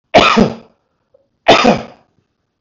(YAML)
three_cough_length: 2.6 s
three_cough_amplitude: 32768
three_cough_signal_mean_std_ratio: 0.41
survey_phase: beta (2021-08-13 to 2022-03-07)
age: 65+
gender: Male
wearing_mask: 'No'
symptom_cough_any: true
symptom_runny_or_blocked_nose: true
symptom_sore_throat: true
symptom_fatigue: true
symptom_headache: true
symptom_other: true
symptom_onset: 4 days
smoker_status: Never smoked
respiratory_condition_asthma: false
respiratory_condition_other: false
recruitment_source: Test and Trace
submission_delay: 1 day
covid_test_result: Positive
covid_test_method: RT-qPCR
covid_ct_value: 26.6
covid_ct_gene: ORF1ab gene